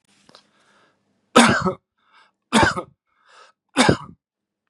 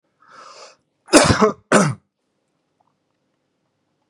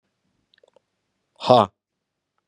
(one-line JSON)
{"three_cough_length": "4.7 s", "three_cough_amplitude": 32768, "three_cough_signal_mean_std_ratio": 0.31, "cough_length": "4.1 s", "cough_amplitude": 32768, "cough_signal_mean_std_ratio": 0.3, "exhalation_length": "2.5 s", "exhalation_amplitude": 30932, "exhalation_signal_mean_std_ratio": 0.2, "survey_phase": "beta (2021-08-13 to 2022-03-07)", "age": "18-44", "gender": "Male", "wearing_mask": "No", "symptom_none": true, "symptom_onset": "6 days", "smoker_status": "Current smoker (e-cigarettes or vapes only)", "respiratory_condition_asthma": false, "respiratory_condition_other": false, "recruitment_source": "Test and Trace", "submission_delay": "2 days", "covid_test_result": "Positive", "covid_test_method": "RT-qPCR", "covid_ct_value": 16.3, "covid_ct_gene": "ORF1ab gene", "covid_ct_mean": 16.5, "covid_viral_load": "3700000 copies/ml", "covid_viral_load_category": "High viral load (>1M copies/ml)"}